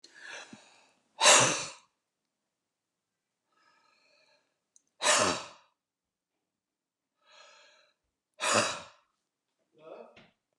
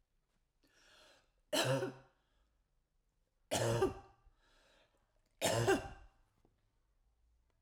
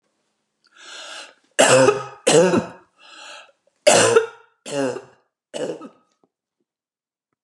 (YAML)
exhalation_length: 10.6 s
exhalation_amplitude: 15431
exhalation_signal_mean_std_ratio: 0.26
three_cough_length: 7.6 s
three_cough_amplitude: 3982
three_cough_signal_mean_std_ratio: 0.34
cough_length: 7.4 s
cough_amplitude: 30848
cough_signal_mean_std_ratio: 0.38
survey_phase: alpha (2021-03-01 to 2021-08-12)
age: 65+
gender: Female
wearing_mask: 'No'
symptom_none: true
smoker_status: Ex-smoker
respiratory_condition_asthma: false
respiratory_condition_other: false
recruitment_source: REACT
submission_delay: 1 day
covid_test_result: Negative
covid_test_method: RT-qPCR